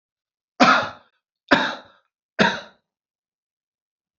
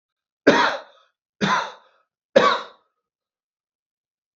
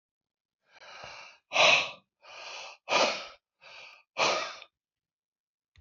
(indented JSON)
{
  "cough_length": "4.2 s",
  "cough_amplitude": 32767,
  "cough_signal_mean_std_ratio": 0.3,
  "three_cough_length": "4.4 s",
  "three_cough_amplitude": 28265,
  "three_cough_signal_mean_std_ratio": 0.32,
  "exhalation_length": "5.8 s",
  "exhalation_amplitude": 11561,
  "exhalation_signal_mean_std_ratio": 0.35,
  "survey_phase": "beta (2021-08-13 to 2022-03-07)",
  "age": "65+",
  "gender": "Male",
  "wearing_mask": "No",
  "symptom_none": true,
  "smoker_status": "Ex-smoker",
  "respiratory_condition_asthma": false,
  "respiratory_condition_other": false,
  "recruitment_source": "REACT",
  "submission_delay": "2 days",
  "covid_test_result": "Negative",
  "covid_test_method": "RT-qPCR",
  "influenza_a_test_result": "Negative",
  "influenza_b_test_result": "Negative"
}